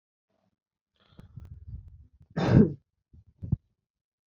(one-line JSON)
{"cough_length": "4.3 s", "cough_amplitude": 17419, "cough_signal_mean_std_ratio": 0.25, "survey_phase": "beta (2021-08-13 to 2022-03-07)", "age": "18-44", "gender": "Male", "wearing_mask": "No", "symptom_cough_any": true, "symptom_runny_or_blocked_nose": true, "symptom_sore_throat": true, "smoker_status": "Never smoked", "respiratory_condition_asthma": false, "respiratory_condition_other": false, "recruitment_source": "Test and Trace", "submission_delay": "1 day", "covid_test_result": "Positive", "covid_test_method": "RT-qPCR", "covid_ct_value": 23.2, "covid_ct_gene": "N gene"}